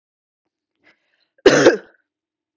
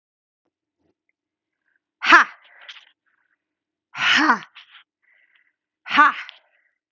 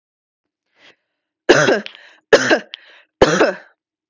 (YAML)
cough_length: 2.6 s
cough_amplitude: 32768
cough_signal_mean_std_ratio: 0.26
exhalation_length: 6.9 s
exhalation_amplitude: 32768
exhalation_signal_mean_std_ratio: 0.26
three_cough_length: 4.1 s
three_cough_amplitude: 32768
three_cough_signal_mean_std_ratio: 0.35
survey_phase: beta (2021-08-13 to 2022-03-07)
age: 18-44
gender: Female
wearing_mask: 'No'
symptom_none: true
symptom_onset: 4 days
smoker_status: Never smoked
respiratory_condition_asthma: true
respiratory_condition_other: false
recruitment_source: Test and Trace
submission_delay: 1 day
covid_test_result: Positive
covid_test_method: RT-qPCR
covid_ct_value: 25.0
covid_ct_gene: N gene